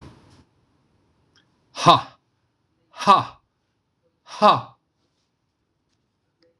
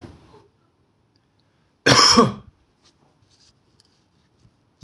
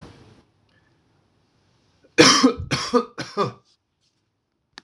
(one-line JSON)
{"exhalation_length": "6.6 s", "exhalation_amplitude": 26028, "exhalation_signal_mean_std_ratio": 0.23, "cough_length": "4.8 s", "cough_amplitude": 26028, "cough_signal_mean_std_ratio": 0.25, "three_cough_length": "4.8 s", "three_cough_amplitude": 26028, "three_cough_signal_mean_std_ratio": 0.3, "survey_phase": "beta (2021-08-13 to 2022-03-07)", "age": "45-64", "gender": "Male", "wearing_mask": "No", "symptom_runny_or_blocked_nose": true, "symptom_sore_throat": true, "smoker_status": "Ex-smoker", "respiratory_condition_asthma": false, "respiratory_condition_other": false, "recruitment_source": "Test and Trace", "submission_delay": "1 day", "covid_test_result": "Positive", "covid_test_method": "RT-qPCR", "covid_ct_value": 20.4, "covid_ct_gene": "N gene"}